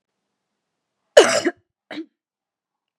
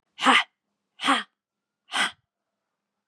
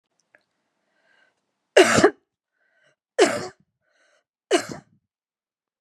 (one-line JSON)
{"cough_length": "3.0 s", "cough_amplitude": 32768, "cough_signal_mean_std_ratio": 0.22, "exhalation_length": "3.1 s", "exhalation_amplitude": 18923, "exhalation_signal_mean_std_ratio": 0.33, "three_cough_length": "5.8 s", "three_cough_amplitude": 29217, "three_cough_signal_mean_std_ratio": 0.25, "survey_phase": "beta (2021-08-13 to 2022-03-07)", "age": "45-64", "gender": "Female", "wearing_mask": "No", "symptom_cough_any": true, "symptom_runny_or_blocked_nose": true, "symptom_headache": true, "smoker_status": "Never smoked", "respiratory_condition_asthma": false, "respiratory_condition_other": false, "recruitment_source": "Test and Trace", "submission_delay": "2 days", "covid_test_result": "Positive", "covid_test_method": "RT-qPCR", "covid_ct_value": 29.8, "covid_ct_gene": "N gene"}